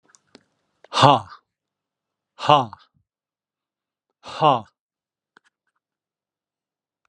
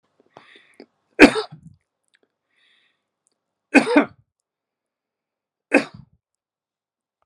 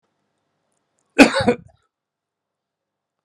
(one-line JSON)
{"exhalation_length": "7.1 s", "exhalation_amplitude": 32768, "exhalation_signal_mean_std_ratio": 0.23, "three_cough_length": "7.3 s", "three_cough_amplitude": 32768, "three_cough_signal_mean_std_ratio": 0.19, "cough_length": "3.2 s", "cough_amplitude": 32768, "cough_signal_mean_std_ratio": 0.21, "survey_phase": "alpha (2021-03-01 to 2021-08-12)", "age": "65+", "gender": "Male", "wearing_mask": "No", "symptom_none": true, "smoker_status": "Never smoked", "respiratory_condition_asthma": false, "respiratory_condition_other": false, "recruitment_source": "REACT", "submission_delay": "9 days", "covid_test_result": "Negative", "covid_test_method": "RT-qPCR"}